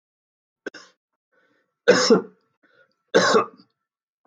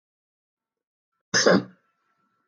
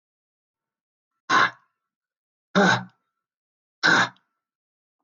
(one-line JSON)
{"three_cough_length": "4.3 s", "three_cough_amplitude": 23573, "three_cough_signal_mean_std_ratio": 0.31, "cough_length": "2.5 s", "cough_amplitude": 18404, "cough_signal_mean_std_ratio": 0.26, "exhalation_length": "5.0 s", "exhalation_amplitude": 16091, "exhalation_signal_mean_std_ratio": 0.3, "survey_phase": "beta (2021-08-13 to 2022-03-07)", "age": "65+", "gender": "Male", "wearing_mask": "No", "symptom_none": true, "smoker_status": "Ex-smoker", "respiratory_condition_asthma": false, "respiratory_condition_other": false, "recruitment_source": "REACT", "submission_delay": "1 day", "covid_test_result": "Negative", "covid_test_method": "RT-qPCR", "influenza_a_test_result": "Negative", "influenza_b_test_result": "Negative"}